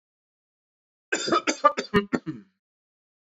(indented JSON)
{
  "cough_length": "3.3 s",
  "cough_amplitude": 18311,
  "cough_signal_mean_std_ratio": 0.32,
  "survey_phase": "beta (2021-08-13 to 2022-03-07)",
  "age": "18-44",
  "gender": "Male",
  "wearing_mask": "No",
  "symptom_sore_throat": true,
  "symptom_onset": "13 days",
  "smoker_status": "Ex-smoker",
  "respiratory_condition_asthma": true,
  "respiratory_condition_other": false,
  "recruitment_source": "REACT",
  "submission_delay": "3 days",
  "covid_test_result": "Negative",
  "covid_test_method": "RT-qPCR",
  "influenza_a_test_result": "Negative",
  "influenza_b_test_result": "Negative"
}